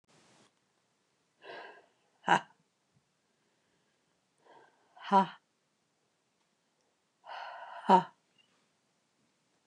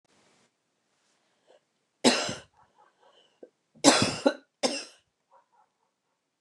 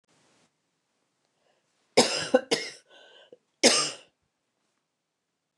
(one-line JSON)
{"exhalation_length": "9.7 s", "exhalation_amplitude": 10780, "exhalation_signal_mean_std_ratio": 0.19, "three_cough_length": "6.4 s", "three_cough_amplitude": 25744, "three_cough_signal_mean_std_ratio": 0.25, "cough_length": "5.6 s", "cough_amplitude": 21673, "cough_signal_mean_std_ratio": 0.26, "survey_phase": "beta (2021-08-13 to 2022-03-07)", "age": "45-64", "gender": "Female", "wearing_mask": "No", "symptom_cough_any": true, "symptom_sore_throat": true, "symptom_fatigue": true, "symptom_headache": true, "symptom_onset": "2 days", "smoker_status": "Ex-smoker", "respiratory_condition_asthma": false, "respiratory_condition_other": false, "recruitment_source": "REACT", "submission_delay": "1 day", "covid_test_result": "Positive", "covid_test_method": "RT-qPCR", "covid_ct_value": 19.7, "covid_ct_gene": "E gene", "influenza_a_test_result": "Negative", "influenza_b_test_result": "Negative"}